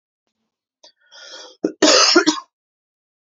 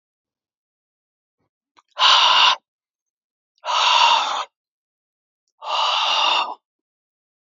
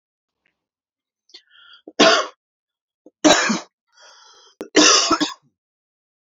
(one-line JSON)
{"cough_length": "3.3 s", "cough_amplitude": 32767, "cough_signal_mean_std_ratio": 0.34, "exhalation_length": "7.5 s", "exhalation_amplitude": 31951, "exhalation_signal_mean_std_ratio": 0.44, "three_cough_length": "6.2 s", "three_cough_amplitude": 32768, "three_cough_signal_mean_std_ratio": 0.33, "survey_phase": "alpha (2021-03-01 to 2021-08-12)", "age": "18-44", "gender": "Male", "wearing_mask": "No", "symptom_change_to_sense_of_smell_or_taste": true, "symptom_onset": "4 days", "smoker_status": "Ex-smoker", "respiratory_condition_asthma": false, "respiratory_condition_other": false, "recruitment_source": "Test and Trace", "submission_delay": "2 days", "covid_test_result": "Positive", "covid_test_method": "RT-qPCR", "covid_ct_value": 31.2, "covid_ct_gene": "ORF1ab gene", "covid_ct_mean": 31.7, "covid_viral_load": "41 copies/ml", "covid_viral_load_category": "Minimal viral load (< 10K copies/ml)"}